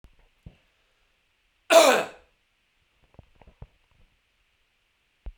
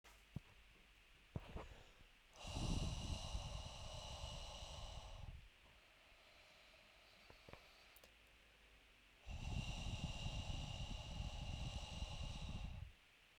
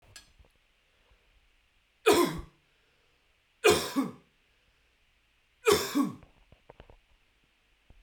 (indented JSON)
{
  "cough_length": "5.4 s",
  "cough_amplitude": 24354,
  "cough_signal_mean_std_ratio": 0.2,
  "exhalation_length": "13.4 s",
  "exhalation_amplitude": 1051,
  "exhalation_signal_mean_std_ratio": 0.71,
  "three_cough_length": "8.0 s",
  "three_cough_amplitude": 13582,
  "three_cough_signal_mean_std_ratio": 0.29,
  "survey_phase": "beta (2021-08-13 to 2022-03-07)",
  "age": "18-44",
  "gender": "Male",
  "wearing_mask": "No",
  "symptom_none": true,
  "smoker_status": "Never smoked",
  "respiratory_condition_asthma": false,
  "respiratory_condition_other": false,
  "recruitment_source": "REACT",
  "submission_delay": "1 day",
  "covid_test_result": "Negative",
  "covid_test_method": "RT-qPCR"
}